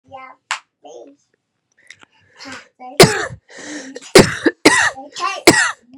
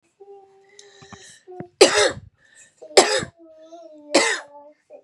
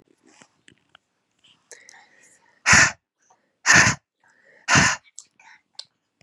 {"cough_length": "6.0 s", "cough_amplitude": 32768, "cough_signal_mean_std_ratio": 0.34, "three_cough_length": "5.0 s", "three_cough_amplitude": 32767, "three_cough_signal_mean_std_ratio": 0.32, "exhalation_length": "6.2 s", "exhalation_amplitude": 31471, "exhalation_signal_mean_std_ratio": 0.29, "survey_phase": "beta (2021-08-13 to 2022-03-07)", "age": "18-44", "gender": "Female", "wearing_mask": "No", "symptom_cough_any": true, "symptom_runny_or_blocked_nose": true, "symptom_fever_high_temperature": true, "symptom_headache": true, "symptom_onset": "2 days", "smoker_status": "Never smoked", "respiratory_condition_asthma": false, "respiratory_condition_other": false, "recruitment_source": "Test and Trace", "submission_delay": "2 days", "covid_test_result": "Positive", "covid_test_method": "RT-qPCR", "covid_ct_value": 18.1, "covid_ct_gene": "ORF1ab gene", "covid_ct_mean": 18.4, "covid_viral_load": "900000 copies/ml", "covid_viral_load_category": "Low viral load (10K-1M copies/ml)"}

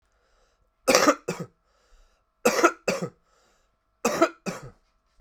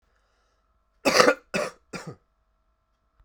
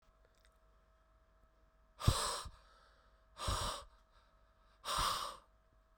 {"three_cough_length": "5.2 s", "three_cough_amplitude": 32767, "three_cough_signal_mean_std_ratio": 0.34, "cough_length": "3.2 s", "cough_amplitude": 32767, "cough_signal_mean_std_ratio": 0.28, "exhalation_length": "6.0 s", "exhalation_amplitude": 5235, "exhalation_signal_mean_std_ratio": 0.38, "survey_phase": "beta (2021-08-13 to 2022-03-07)", "age": "45-64", "gender": "Male", "wearing_mask": "No", "symptom_cough_any": true, "symptom_change_to_sense_of_smell_or_taste": true, "smoker_status": "Ex-smoker", "respiratory_condition_asthma": true, "respiratory_condition_other": false, "recruitment_source": "Test and Trace", "submission_delay": "2 days", "covid_test_result": "Positive", "covid_test_method": "RT-qPCR"}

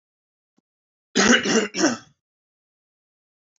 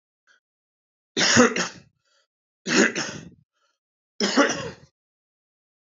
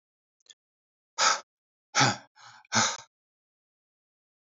{"cough_length": "3.6 s", "cough_amplitude": 21371, "cough_signal_mean_std_ratio": 0.34, "three_cough_length": "6.0 s", "three_cough_amplitude": 21300, "three_cough_signal_mean_std_ratio": 0.35, "exhalation_length": "4.5 s", "exhalation_amplitude": 13021, "exhalation_signal_mean_std_ratio": 0.29, "survey_phase": "beta (2021-08-13 to 2022-03-07)", "age": "18-44", "gender": "Male", "wearing_mask": "No", "symptom_none": true, "symptom_onset": "13 days", "smoker_status": "Never smoked", "respiratory_condition_asthma": false, "respiratory_condition_other": false, "recruitment_source": "REACT", "submission_delay": "1 day", "covid_test_result": "Negative", "covid_test_method": "RT-qPCR", "influenza_a_test_result": "Negative", "influenza_b_test_result": "Negative"}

